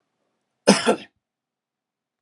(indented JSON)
{
  "cough_length": "2.2 s",
  "cough_amplitude": 32545,
  "cough_signal_mean_std_ratio": 0.24,
  "survey_phase": "beta (2021-08-13 to 2022-03-07)",
  "age": "45-64",
  "gender": "Male",
  "wearing_mask": "No",
  "symptom_abdominal_pain": true,
  "symptom_fatigue": true,
  "symptom_fever_high_temperature": true,
  "symptom_onset": "12 days",
  "smoker_status": "Never smoked",
  "respiratory_condition_asthma": false,
  "respiratory_condition_other": false,
  "recruitment_source": "REACT",
  "submission_delay": "1 day",
  "covid_test_result": "Negative",
  "covid_test_method": "RT-qPCR"
}